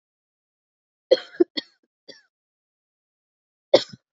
{"three_cough_length": "4.2 s", "three_cough_amplitude": 29321, "three_cough_signal_mean_std_ratio": 0.15, "survey_phase": "beta (2021-08-13 to 2022-03-07)", "age": "18-44", "gender": "Female", "wearing_mask": "No", "symptom_cough_any": true, "symptom_runny_or_blocked_nose": true, "symptom_sore_throat": true, "symptom_fatigue": true, "symptom_fever_high_temperature": true, "symptom_headache": true, "symptom_other": true, "smoker_status": "Never smoked", "respiratory_condition_asthma": false, "respiratory_condition_other": false, "recruitment_source": "Test and Trace", "submission_delay": "1 day", "covid_test_result": "Positive", "covid_test_method": "LFT"}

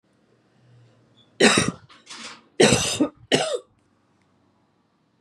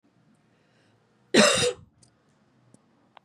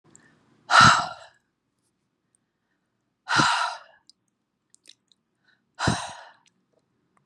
{"three_cough_length": "5.2 s", "three_cough_amplitude": 29319, "three_cough_signal_mean_std_ratio": 0.34, "cough_length": "3.2 s", "cough_amplitude": 19064, "cough_signal_mean_std_ratio": 0.28, "exhalation_length": "7.3 s", "exhalation_amplitude": 28273, "exhalation_signal_mean_std_ratio": 0.27, "survey_phase": "beta (2021-08-13 to 2022-03-07)", "age": "45-64", "gender": "Female", "wearing_mask": "No", "symptom_cough_any": true, "smoker_status": "Never smoked", "respiratory_condition_asthma": false, "respiratory_condition_other": false, "recruitment_source": "REACT", "submission_delay": "1 day", "covid_test_result": "Negative", "covid_test_method": "RT-qPCR", "influenza_a_test_result": "Negative", "influenza_b_test_result": "Negative"}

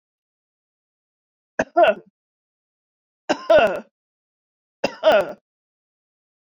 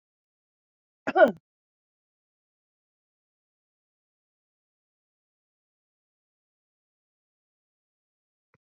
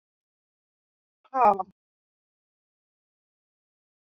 {"three_cough_length": "6.6 s", "three_cough_amplitude": 21081, "three_cough_signal_mean_std_ratio": 0.29, "cough_length": "8.6 s", "cough_amplitude": 18698, "cough_signal_mean_std_ratio": 0.11, "exhalation_length": "4.0 s", "exhalation_amplitude": 14033, "exhalation_signal_mean_std_ratio": 0.18, "survey_phase": "beta (2021-08-13 to 2022-03-07)", "age": "65+", "gender": "Female", "wearing_mask": "No", "symptom_none": true, "smoker_status": "Never smoked", "respiratory_condition_asthma": false, "respiratory_condition_other": false, "recruitment_source": "REACT", "submission_delay": "1 day", "covid_test_result": "Negative", "covid_test_method": "RT-qPCR"}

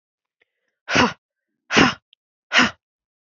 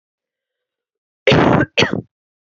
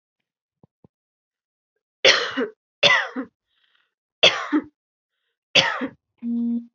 {"exhalation_length": "3.3 s", "exhalation_amplitude": 29042, "exhalation_signal_mean_std_ratio": 0.32, "cough_length": "2.5 s", "cough_amplitude": 29425, "cough_signal_mean_std_ratio": 0.38, "three_cough_length": "6.7 s", "three_cough_amplitude": 30710, "three_cough_signal_mean_std_ratio": 0.36, "survey_phase": "beta (2021-08-13 to 2022-03-07)", "age": "18-44", "gender": "Female", "wearing_mask": "No", "symptom_runny_or_blocked_nose": true, "symptom_sore_throat": true, "symptom_fatigue": true, "symptom_fever_high_temperature": true, "symptom_headache": true, "symptom_change_to_sense_of_smell_or_taste": true, "smoker_status": "Never smoked", "respiratory_condition_asthma": false, "respiratory_condition_other": false, "recruitment_source": "Test and Trace", "submission_delay": "1 day", "covid_test_result": "Positive", "covid_test_method": "RT-qPCR", "covid_ct_value": 16.9, "covid_ct_gene": "ORF1ab gene", "covid_ct_mean": 17.7, "covid_viral_load": "1600000 copies/ml", "covid_viral_load_category": "High viral load (>1M copies/ml)"}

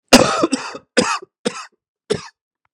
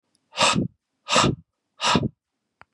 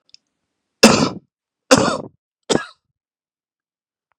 {"cough_length": "2.7 s", "cough_amplitude": 32768, "cough_signal_mean_std_ratio": 0.38, "exhalation_length": "2.7 s", "exhalation_amplitude": 20859, "exhalation_signal_mean_std_ratio": 0.44, "three_cough_length": "4.2 s", "three_cough_amplitude": 32768, "three_cough_signal_mean_std_ratio": 0.28, "survey_phase": "beta (2021-08-13 to 2022-03-07)", "age": "45-64", "gender": "Male", "wearing_mask": "No", "symptom_cough_any": true, "symptom_runny_or_blocked_nose": true, "symptom_sore_throat": true, "symptom_onset": "4 days", "smoker_status": "Never smoked", "respiratory_condition_asthma": false, "respiratory_condition_other": false, "recruitment_source": "Test and Trace", "submission_delay": "3 days", "covid_test_result": "Positive", "covid_test_method": "RT-qPCR", "covid_ct_value": 30.4, "covid_ct_gene": "ORF1ab gene"}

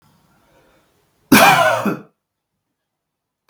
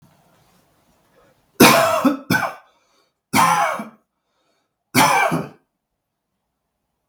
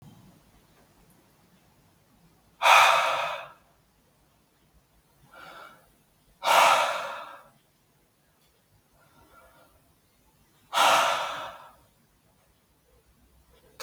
{"cough_length": "3.5 s", "cough_amplitude": 32768, "cough_signal_mean_std_ratio": 0.33, "three_cough_length": "7.1 s", "three_cough_amplitude": 32768, "three_cough_signal_mean_std_ratio": 0.39, "exhalation_length": "13.8 s", "exhalation_amplitude": 19946, "exhalation_signal_mean_std_ratio": 0.31, "survey_phase": "beta (2021-08-13 to 2022-03-07)", "age": "18-44", "gender": "Male", "wearing_mask": "No", "symptom_none": true, "smoker_status": "Ex-smoker", "respiratory_condition_asthma": false, "respiratory_condition_other": false, "recruitment_source": "REACT", "submission_delay": "3 days", "covid_test_result": "Negative", "covid_test_method": "RT-qPCR", "influenza_a_test_result": "Negative", "influenza_b_test_result": "Negative"}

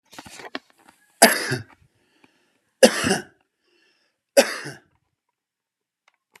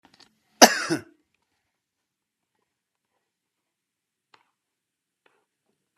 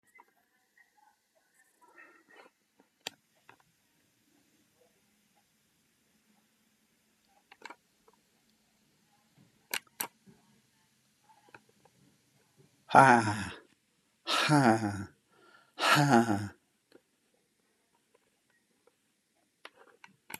{"three_cough_length": "6.4 s", "three_cough_amplitude": 32768, "three_cough_signal_mean_std_ratio": 0.24, "cough_length": "6.0 s", "cough_amplitude": 32768, "cough_signal_mean_std_ratio": 0.12, "exhalation_length": "20.4 s", "exhalation_amplitude": 20045, "exhalation_signal_mean_std_ratio": 0.22, "survey_phase": "beta (2021-08-13 to 2022-03-07)", "age": "65+", "gender": "Male", "wearing_mask": "No", "symptom_cough_any": true, "symptom_shortness_of_breath": true, "symptom_onset": "12 days", "smoker_status": "Never smoked", "respiratory_condition_asthma": false, "respiratory_condition_other": true, "recruitment_source": "REACT", "submission_delay": "10 days", "covid_test_result": "Negative", "covid_test_method": "RT-qPCR", "covid_ct_value": 28.0, "covid_ct_gene": "E gene"}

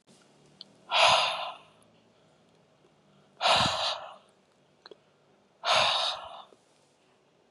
{"exhalation_length": "7.5 s", "exhalation_amplitude": 10340, "exhalation_signal_mean_std_ratio": 0.39, "survey_phase": "beta (2021-08-13 to 2022-03-07)", "age": "18-44", "gender": "Female", "wearing_mask": "No", "symptom_none": true, "smoker_status": "Current smoker (11 or more cigarettes per day)", "respiratory_condition_asthma": false, "respiratory_condition_other": false, "recruitment_source": "REACT", "submission_delay": "1 day", "covid_test_result": "Negative", "covid_test_method": "RT-qPCR"}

